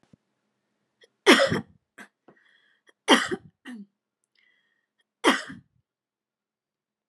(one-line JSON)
{"three_cough_length": "7.1 s", "three_cough_amplitude": 26889, "three_cough_signal_mean_std_ratio": 0.23, "survey_phase": "alpha (2021-03-01 to 2021-08-12)", "age": "45-64", "gender": "Female", "wearing_mask": "No", "symptom_none": true, "smoker_status": "Never smoked", "respiratory_condition_asthma": false, "respiratory_condition_other": false, "recruitment_source": "REACT", "submission_delay": "1 day", "covid_test_result": "Negative", "covid_test_method": "RT-qPCR"}